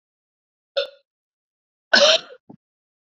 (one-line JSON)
{"cough_length": "3.1 s", "cough_amplitude": 28482, "cough_signal_mean_std_ratio": 0.26, "survey_phase": "beta (2021-08-13 to 2022-03-07)", "age": "18-44", "gender": "Female", "wearing_mask": "No", "symptom_cough_any": true, "symptom_shortness_of_breath": true, "symptom_sore_throat": true, "symptom_fatigue": true, "symptom_headache": true, "symptom_onset": "8 days", "smoker_status": "Ex-smoker", "respiratory_condition_asthma": true, "respiratory_condition_other": false, "recruitment_source": "Test and Trace", "submission_delay": "3 days", "covid_test_result": "Positive", "covid_test_method": "ePCR"}